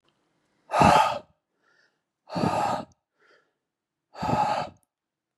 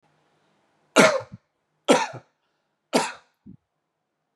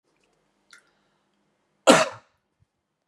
exhalation_length: 5.4 s
exhalation_amplitude: 17334
exhalation_signal_mean_std_ratio: 0.39
three_cough_length: 4.4 s
three_cough_amplitude: 31393
three_cough_signal_mean_std_ratio: 0.27
cough_length: 3.1 s
cough_amplitude: 32534
cough_signal_mean_std_ratio: 0.19
survey_phase: beta (2021-08-13 to 2022-03-07)
age: 45-64
gender: Male
wearing_mask: 'No'
symptom_none: true
symptom_onset: 13 days
smoker_status: Never smoked
respiratory_condition_asthma: false
respiratory_condition_other: false
recruitment_source: REACT
submission_delay: 11 days
covid_test_result: Negative
covid_test_method: RT-qPCR
influenza_a_test_result: Negative
influenza_b_test_result: Negative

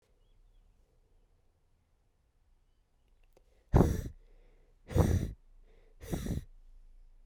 exhalation_length: 7.3 s
exhalation_amplitude: 10973
exhalation_signal_mean_std_ratio: 0.29
survey_phase: beta (2021-08-13 to 2022-03-07)
age: 65+
gender: Female
wearing_mask: 'Yes'
symptom_cough_any: true
symptom_new_continuous_cough: true
symptom_runny_or_blocked_nose: true
symptom_shortness_of_breath: true
symptom_sore_throat: true
symptom_fatigue: true
symptom_fever_high_temperature: true
symptom_headache: true
symptom_change_to_sense_of_smell_or_taste: true
symptom_onset: 3 days
smoker_status: Current smoker (1 to 10 cigarettes per day)
respiratory_condition_asthma: false
respiratory_condition_other: false
recruitment_source: Test and Trace
submission_delay: 2 days
covid_test_result: Positive
covid_test_method: ePCR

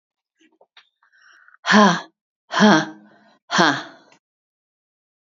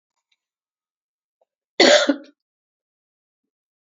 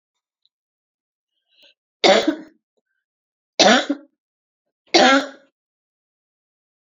exhalation_length: 5.4 s
exhalation_amplitude: 32767
exhalation_signal_mean_std_ratio: 0.32
cough_length: 3.8 s
cough_amplitude: 31247
cough_signal_mean_std_ratio: 0.23
three_cough_length: 6.8 s
three_cough_amplitude: 30794
three_cough_signal_mean_std_ratio: 0.28
survey_phase: beta (2021-08-13 to 2022-03-07)
age: 45-64
gender: Female
wearing_mask: 'No'
symptom_cough_any: true
symptom_runny_or_blocked_nose: true
symptom_diarrhoea: true
symptom_fatigue: true
symptom_change_to_sense_of_smell_or_taste: true
symptom_onset: 9 days
smoker_status: Never smoked
respiratory_condition_asthma: false
respiratory_condition_other: false
recruitment_source: Test and Trace
submission_delay: 1 day
covid_test_result: Positive
covid_test_method: RT-qPCR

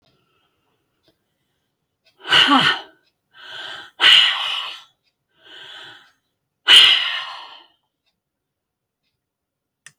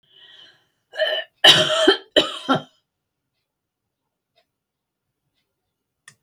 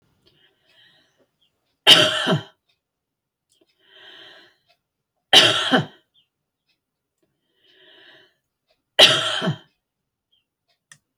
exhalation_length: 10.0 s
exhalation_amplitude: 30997
exhalation_signal_mean_std_ratio: 0.32
cough_length: 6.2 s
cough_amplitude: 32264
cough_signal_mean_std_ratio: 0.29
three_cough_length: 11.2 s
three_cough_amplitude: 30273
three_cough_signal_mean_std_ratio: 0.26
survey_phase: alpha (2021-03-01 to 2021-08-12)
age: 65+
gender: Female
wearing_mask: 'No'
symptom_none: true
smoker_status: Ex-smoker
respiratory_condition_asthma: false
respiratory_condition_other: false
recruitment_source: REACT
submission_delay: 1 day
covid_test_result: Negative
covid_test_method: RT-qPCR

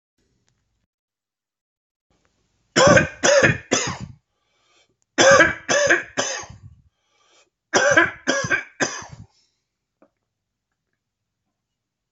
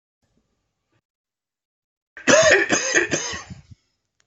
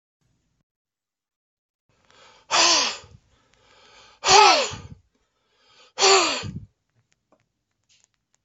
three_cough_length: 12.1 s
three_cough_amplitude: 28481
three_cough_signal_mean_std_ratio: 0.36
cough_length: 4.3 s
cough_amplitude: 25533
cough_signal_mean_std_ratio: 0.37
exhalation_length: 8.4 s
exhalation_amplitude: 28001
exhalation_signal_mean_std_ratio: 0.31
survey_phase: alpha (2021-03-01 to 2021-08-12)
age: 65+
gender: Male
wearing_mask: 'No'
symptom_shortness_of_breath: true
symptom_fatigue: true
symptom_onset: 12 days
smoker_status: Never smoked
respiratory_condition_asthma: true
respiratory_condition_other: true
recruitment_source: REACT
submission_delay: 1 day
covid_test_result: Negative
covid_test_method: RT-qPCR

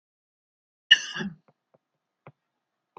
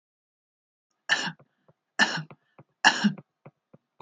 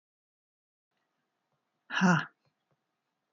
cough_length: 3.0 s
cough_amplitude: 28387
cough_signal_mean_std_ratio: 0.16
three_cough_length: 4.0 s
three_cough_amplitude: 20174
three_cough_signal_mean_std_ratio: 0.28
exhalation_length: 3.3 s
exhalation_amplitude: 6557
exhalation_signal_mean_std_ratio: 0.24
survey_phase: beta (2021-08-13 to 2022-03-07)
age: 65+
gender: Female
wearing_mask: 'No'
symptom_none: true
smoker_status: Never smoked
respiratory_condition_asthma: false
respiratory_condition_other: false
recruitment_source: REACT
submission_delay: 1 day
covid_test_result: Negative
covid_test_method: RT-qPCR
influenza_a_test_result: Negative
influenza_b_test_result: Negative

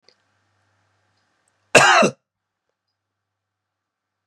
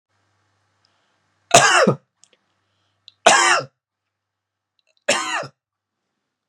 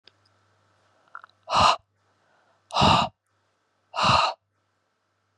cough_length: 4.3 s
cough_amplitude: 32768
cough_signal_mean_std_ratio: 0.23
three_cough_length: 6.5 s
three_cough_amplitude: 32768
three_cough_signal_mean_std_ratio: 0.3
exhalation_length: 5.4 s
exhalation_amplitude: 18140
exhalation_signal_mean_std_ratio: 0.34
survey_phase: beta (2021-08-13 to 2022-03-07)
age: 18-44
gender: Male
wearing_mask: 'No'
symptom_none: true
smoker_status: Never smoked
respiratory_condition_asthma: false
respiratory_condition_other: false
recruitment_source: REACT
submission_delay: 3 days
covid_test_result: Negative
covid_test_method: RT-qPCR
influenza_a_test_result: Unknown/Void
influenza_b_test_result: Unknown/Void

